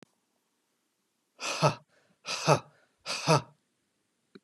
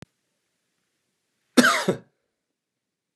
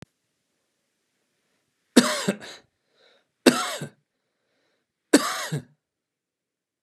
{"exhalation_length": "4.4 s", "exhalation_amplitude": 14179, "exhalation_signal_mean_std_ratio": 0.3, "cough_length": "3.2 s", "cough_amplitude": 28317, "cough_signal_mean_std_ratio": 0.23, "three_cough_length": "6.8 s", "three_cough_amplitude": 31666, "three_cough_signal_mean_std_ratio": 0.24, "survey_phase": "beta (2021-08-13 to 2022-03-07)", "age": "45-64", "gender": "Male", "wearing_mask": "No", "symptom_none": true, "smoker_status": "Never smoked", "respiratory_condition_asthma": false, "respiratory_condition_other": false, "recruitment_source": "Test and Trace", "submission_delay": "2 days", "covid_test_result": "Positive", "covid_test_method": "RT-qPCR", "covid_ct_value": 34.5, "covid_ct_gene": "ORF1ab gene"}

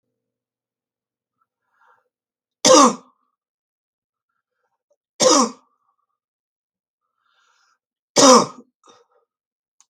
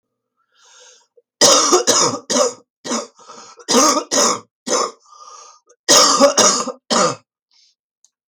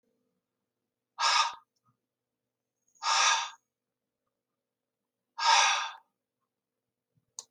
{"three_cough_length": "9.9 s", "three_cough_amplitude": 32768, "three_cough_signal_mean_std_ratio": 0.23, "cough_length": "8.3 s", "cough_amplitude": 32768, "cough_signal_mean_std_ratio": 0.49, "exhalation_length": "7.5 s", "exhalation_amplitude": 10261, "exhalation_signal_mean_std_ratio": 0.32, "survey_phase": "beta (2021-08-13 to 2022-03-07)", "age": "65+", "gender": "Female", "wearing_mask": "No", "symptom_cough_any": true, "symptom_onset": "7 days", "smoker_status": "Ex-smoker", "respiratory_condition_asthma": false, "respiratory_condition_other": false, "recruitment_source": "Test and Trace", "submission_delay": "1 day", "covid_test_result": "Positive", "covid_test_method": "ePCR"}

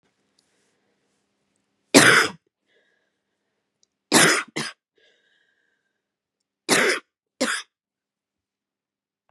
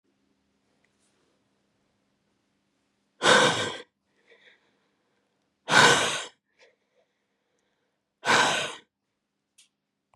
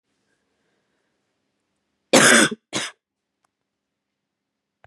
{"three_cough_length": "9.3 s", "three_cough_amplitude": 32767, "three_cough_signal_mean_std_ratio": 0.26, "exhalation_length": "10.2 s", "exhalation_amplitude": 24507, "exhalation_signal_mean_std_ratio": 0.28, "cough_length": "4.9 s", "cough_amplitude": 32469, "cough_signal_mean_std_ratio": 0.24, "survey_phase": "beta (2021-08-13 to 2022-03-07)", "age": "18-44", "gender": "Female", "wearing_mask": "No", "symptom_runny_or_blocked_nose": true, "symptom_fatigue": true, "symptom_headache": true, "symptom_other": true, "symptom_onset": "3 days", "smoker_status": "Prefer not to say", "respiratory_condition_asthma": false, "respiratory_condition_other": false, "recruitment_source": "Test and Trace", "submission_delay": "2 days", "covid_test_result": "Positive", "covid_test_method": "RT-qPCR", "covid_ct_value": 16.9, "covid_ct_gene": "ORF1ab gene"}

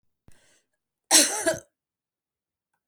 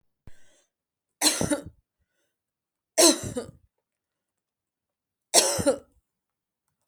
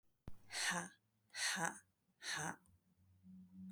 {"cough_length": "2.9 s", "cough_amplitude": 29746, "cough_signal_mean_std_ratio": 0.27, "three_cough_length": "6.9 s", "three_cough_amplitude": 26948, "three_cough_signal_mean_std_ratio": 0.28, "exhalation_length": "3.7 s", "exhalation_amplitude": 2267, "exhalation_signal_mean_std_ratio": 0.52, "survey_phase": "beta (2021-08-13 to 2022-03-07)", "age": "45-64", "gender": "Female", "wearing_mask": "No", "symptom_none": true, "smoker_status": "Never smoked", "respiratory_condition_asthma": false, "respiratory_condition_other": false, "recruitment_source": "REACT", "submission_delay": "10 days", "covid_test_result": "Negative", "covid_test_method": "RT-qPCR"}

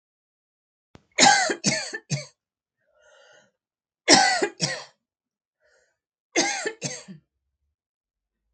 {"three_cough_length": "8.5 s", "three_cough_amplitude": 32766, "three_cough_signal_mean_std_ratio": 0.32, "survey_phase": "beta (2021-08-13 to 2022-03-07)", "age": "45-64", "gender": "Female", "wearing_mask": "No", "symptom_none": true, "smoker_status": "Never smoked", "respiratory_condition_asthma": false, "respiratory_condition_other": false, "recruitment_source": "REACT", "submission_delay": "3 days", "covid_test_result": "Negative", "covid_test_method": "RT-qPCR", "influenza_a_test_result": "Negative", "influenza_b_test_result": "Negative"}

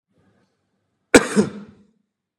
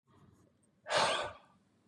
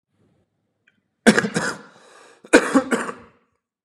{"cough_length": "2.4 s", "cough_amplitude": 32768, "cough_signal_mean_std_ratio": 0.23, "exhalation_length": "1.9 s", "exhalation_amplitude": 4119, "exhalation_signal_mean_std_ratio": 0.4, "three_cough_length": "3.8 s", "three_cough_amplitude": 32767, "three_cough_signal_mean_std_ratio": 0.32, "survey_phase": "beta (2021-08-13 to 2022-03-07)", "age": "18-44", "gender": "Male", "wearing_mask": "No", "symptom_cough_any": true, "symptom_runny_or_blocked_nose": true, "symptom_onset": "8 days", "smoker_status": "Never smoked", "respiratory_condition_asthma": false, "respiratory_condition_other": false, "recruitment_source": "REACT", "submission_delay": "1 day", "covid_test_result": "Negative", "covid_test_method": "RT-qPCR"}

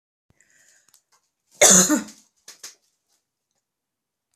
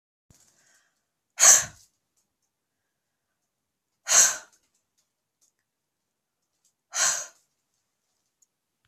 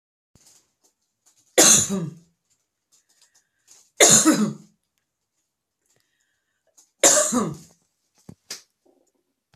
{"cough_length": "4.4 s", "cough_amplitude": 32238, "cough_signal_mean_std_ratio": 0.24, "exhalation_length": "8.9 s", "exhalation_amplitude": 26607, "exhalation_signal_mean_std_ratio": 0.21, "three_cough_length": "9.6 s", "three_cough_amplitude": 32768, "three_cough_signal_mean_std_ratio": 0.3, "survey_phase": "beta (2021-08-13 to 2022-03-07)", "age": "45-64", "gender": "Female", "wearing_mask": "No", "symptom_none": true, "smoker_status": "Ex-smoker", "respiratory_condition_asthma": false, "respiratory_condition_other": false, "recruitment_source": "REACT", "submission_delay": "1 day", "covid_test_result": "Negative", "covid_test_method": "RT-qPCR"}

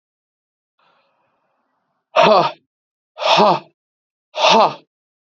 {"exhalation_length": "5.3 s", "exhalation_amplitude": 32768, "exhalation_signal_mean_std_ratio": 0.35, "survey_phase": "beta (2021-08-13 to 2022-03-07)", "age": "18-44", "gender": "Male", "wearing_mask": "No", "symptom_fatigue": true, "symptom_other": true, "smoker_status": "Never smoked", "respiratory_condition_asthma": false, "respiratory_condition_other": false, "recruitment_source": "REACT", "submission_delay": "1 day", "covid_test_result": "Negative", "covid_test_method": "RT-qPCR", "influenza_a_test_result": "Negative", "influenza_b_test_result": "Negative"}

